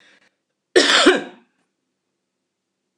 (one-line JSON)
{"cough_length": "3.0 s", "cough_amplitude": 26028, "cough_signal_mean_std_ratio": 0.31, "survey_phase": "alpha (2021-03-01 to 2021-08-12)", "age": "65+", "gender": "Female", "wearing_mask": "No", "symptom_none": true, "smoker_status": "Never smoked", "respiratory_condition_asthma": false, "respiratory_condition_other": false, "recruitment_source": "REACT", "submission_delay": "12 days", "covid_test_result": "Negative", "covid_test_method": "RT-qPCR"}